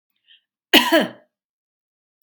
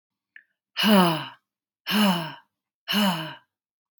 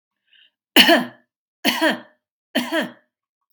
{"cough_length": "2.2 s", "cough_amplitude": 32768, "cough_signal_mean_std_ratio": 0.28, "exhalation_length": "4.0 s", "exhalation_amplitude": 16765, "exhalation_signal_mean_std_ratio": 0.45, "three_cough_length": "3.5 s", "three_cough_amplitude": 32767, "three_cough_signal_mean_std_ratio": 0.36, "survey_phase": "beta (2021-08-13 to 2022-03-07)", "age": "18-44", "gender": "Female", "wearing_mask": "No", "symptom_fatigue": true, "symptom_onset": "12 days", "smoker_status": "Ex-smoker", "respiratory_condition_asthma": false, "respiratory_condition_other": false, "recruitment_source": "REACT", "submission_delay": "2 days", "covid_test_result": "Negative", "covid_test_method": "RT-qPCR", "influenza_a_test_result": "Negative", "influenza_b_test_result": "Negative"}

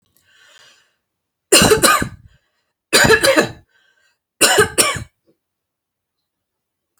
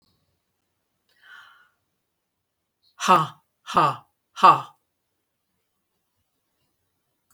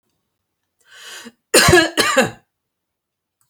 {"three_cough_length": "7.0 s", "three_cough_amplitude": 32768, "three_cough_signal_mean_std_ratio": 0.37, "exhalation_length": "7.3 s", "exhalation_amplitude": 27193, "exhalation_signal_mean_std_ratio": 0.22, "cough_length": "3.5 s", "cough_amplitude": 32768, "cough_signal_mean_std_ratio": 0.35, "survey_phase": "beta (2021-08-13 to 2022-03-07)", "age": "65+", "gender": "Female", "wearing_mask": "No", "symptom_none": true, "smoker_status": "Never smoked", "respiratory_condition_asthma": false, "respiratory_condition_other": false, "recruitment_source": "REACT", "submission_delay": "1 day", "covid_test_result": "Negative", "covid_test_method": "RT-qPCR"}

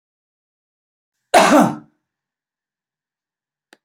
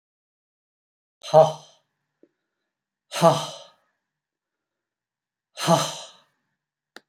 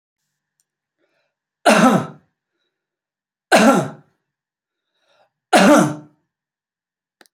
{"cough_length": "3.8 s", "cough_amplitude": 29004, "cough_signal_mean_std_ratio": 0.26, "exhalation_length": "7.1 s", "exhalation_amplitude": 27231, "exhalation_signal_mean_std_ratio": 0.24, "three_cough_length": "7.3 s", "three_cough_amplitude": 30361, "three_cough_signal_mean_std_ratio": 0.32, "survey_phase": "beta (2021-08-13 to 2022-03-07)", "age": "45-64", "gender": "Male", "wearing_mask": "No", "symptom_none": true, "smoker_status": "Ex-smoker", "respiratory_condition_asthma": false, "respiratory_condition_other": false, "recruitment_source": "REACT", "submission_delay": "5 days", "covid_test_result": "Negative", "covid_test_method": "RT-qPCR", "influenza_a_test_result": "Negative", "influenza_b_test_result": "Negative"}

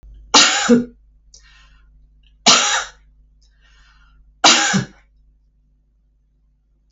{"three_cough_length": "6.9 s", "three_cough_amplitude": 32768, "three_cough_signal_mean_std_ratio": 0.34, "survey_phase": "beta (2021-08-13 to 2022-03-07)", "age": "65+", "gender": "Female", "wearing_mask": "No", "symptom_none": true, "smoker_status": "Ex-smoker", "respiratory_condition_asthma": true, "respiratory_condition_other": false, "recruitment_source": "Test and Trace", "submission_delay": "0 days", "covid_test_result": "Negative", "covid_test_method": "LFT"}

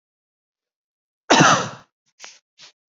{"cough_length": "2.9 s", "cough_amplitude": 29098, "cough_signal_mean_std_ratio": 0.28, "survey_phase": "alpha (2021-03-01 to 2021-08-12)", "age": "45-64", "gender": "Male", "wearing_mask": "No", "symptom_none": true, "smoker_status": "Never smoked", "respiratory_condition_asthma": false, "respiratory_condition_other": false, "recruitment_source": "REACT", "submission_delay": "3 days", "covid_test_result": "Negative", "covid_test_method": "RT-qPCR"}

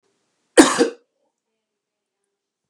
{"cough_length": "2.7 s", "cough_amplitude": 32768, "cough_signal_mean_std_ratio": 0.22, "survey_phase": "beta (2021-08-13 to 2022-03-07)", "age": "65+", "gender": "Male", "wearing_mask": "No", "symptom_none": true, "smoker_status": "Never smoked", "respiratory_condition_asthma": false, "respiratory_condition_other": false, "recruitment_source": "REACT", "submission_delay": "1 day", "covid_test_result": "Negative", "covid_test_method": "RT-qPCR", "influenza_a_test_result": "Negative", "influenza_b_test_result": "Negative"}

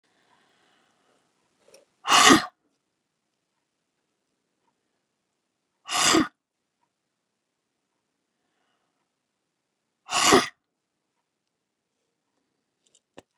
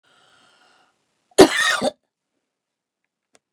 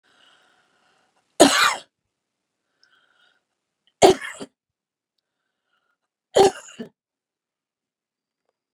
{"exhalation_length": "13.4 s", "exhalation_amplitude": 25711, "exhalation_signal_mean_std_ratio": 0.2, "cough_length": "3.5 s", "cough_amplitude": 32768, "cough_signal_mean_std_ratio": 0.23, "three_cough_length": "8.7 s", "three_cough_amplitude": 32768, "three_cough_signal_mean_std_ratio": 0.2, "survey_phase": "beta (2021-08-13 to 2022-03-07)", "age": "65+", "gender": "Female", "wearing_mask": "No", "symptom_none": true, "smoker_status": "Never smoked", "respiratory_condition_asthma": false, "respiratory_condition_other": false, "recruitment_source": "REACT", "submission_delay": "1 day", "covid_test_result": "Negative", "covid_test_method": "RT-qPCR"}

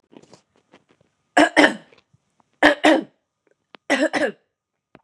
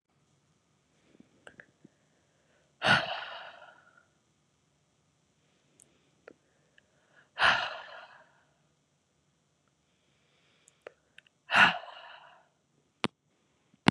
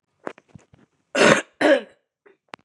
{"three_cough_length": "5.0 s", "three_cough_amplitude": 32767, "three_cough_signal_mean_std_ratio": 0.32, "exhalation_length": "13.9 s", "exhalation_amplitude": 21060, "exhalation_signal_mean_std_ratio": 0.21, "cough_length": "2.6 s", "cough_amplitude": 32767, "cough_signal_mean_std_ratio": 0.34, "survey_phase": "beta (2021-08-13 to 2022-03-07)", "age": "18-44", "gender": "Female", "wearing_mask": "No", "symptom_cough_any": true, "symptom_sore_throat": true, "symptom_fatigue": true, "symptom_headache": true, "symptom_onset": "4 days", "smoker_status": "Never smoked", "respiratory_condition_asthma": false, "respiratory_condition_other": false, "recruitment_source": "Test and Trace", "submission_delay": "2 days", "covid_test_result": "Positive", "covid_test_method": "RT-qPCR", "covid_ct_value": 27.0, "covid_ct_gene": "N gene"}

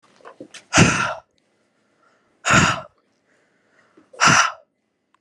{"exhalation_length": "5.2 s", "exhalation_amplitude": 30282, "exhalation_signal_mean_std_ratio": 0.35, "survey_phase": "beta (2021-08-13 to 2022-03-07)", "age": "18-44", "gender": "Female", "wearing_mask": "No", "symptom_none": true, "smoker_status": "Never smoked", "respiratory_condition_asthma": false, "respiratory_condition_other": false, "recruitment_source": "REACT", "submission_delay": "1 day", "covid_test_result": "Negative", "covid_test_method": "RT-qPCR"}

